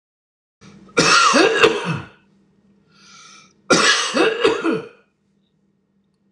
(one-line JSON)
{"cough_length": "6.3 s", "cough_amplitude": 26028, "cough_signal_mean_std_ratio": 0.47, "survey_phase": "alpha (2021-03-01 to 2021-08-12)", "age": "65+", "gender": "Male", "wearing_mask": "No", "symptom_none": true, "smoker_status": "Ex-smoker", "respiratory_condition_asthma": false, "respiratory_condition_other": false, "recruitment_source": "REACT", "submission_delay": "2 days", "covid_test_result": "Negative", "covid_test_method": "RT-qPCR"}